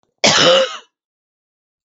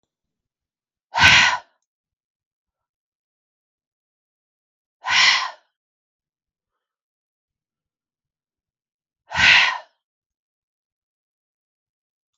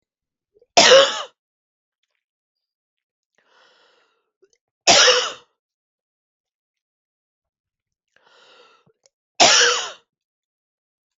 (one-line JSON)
{"cough_length": "1.9 s", "cough_amplitude": 32768, "cough_signal_mean_std_ratio": 0.43, "exhalation_length": "12.4 s", "exhalation_amplitude": 32768, "exhalation_signal_mean_std_ratio": 0.24, "three_cough_length": "11.2 s", "three_cough_amplitude": 32768, "three_cough_signal_mean_std_ratio": 0.26, "survey_phase": "beta (2021-08-13 to 2022-03-07)", "age": "45-64", "gender": "Female", "wearing_mask": "No", "symptom_none": true, "smoker_status": "Never smoked", "respiratory_condition_asthma": false, "respiratory_condition_other": false, "recruitment_source": "Test and Trace", "submission_delay": "1 day", "covid_test_result": "Negative", "covid_test_method": "RT-qPCR"}